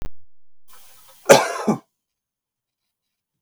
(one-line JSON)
{"cough_length": "3.4 s", "cough_amplitude": 32768, "cough_signal_mean_std_ratio": 0.3, "survey_phase": "beta (2021-08-13 to 2022-03-07)", "age": "65+", "gender": "Male", "wearing_mask": "No", "symptom_none": true, "symptom_onset": "12 days", "smoker_status": "Never smoked", "respiratory_condition_asthma": false, "respiratory_condition_other": false, "recruitment_source": "REACT", "submission_delay": "1 day", "covid_test_result": "Negative", "covid_test_method": "RT-qPCR"}